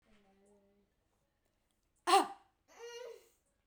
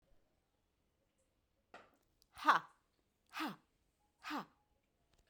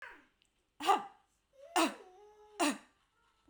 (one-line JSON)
{"cough_length": "3.7 s", "cough_amplitude": 6015, "cough_signal_mean_std_ratio": 0.22, "exhalation_length": "5.3 s", "exhalation_amplitude": 4807, "exhalation_signal_mean_std_ratio": 0.2, "three_cough_length": "3.5 s", "three_cough_amplitude": 5126, "three_cough_signal_mean_std_ratio": 0.34, "survey_phase": "beta (2021-08-13 to 2022-03-07)", "age": "45-64", "gender": "Female", "wearing_mask": "No", "symptom_none": true, "symptom_onset": "8 days", "smoker_status": "Never smoked", "respiratory_condition_asthma": false, "respiratory_condition_other": false, "recruitment_source": "REACT", "submission_delay": "3 days", "covid_test_result": "Negative", "covid_test_method": "RT-qPCR"}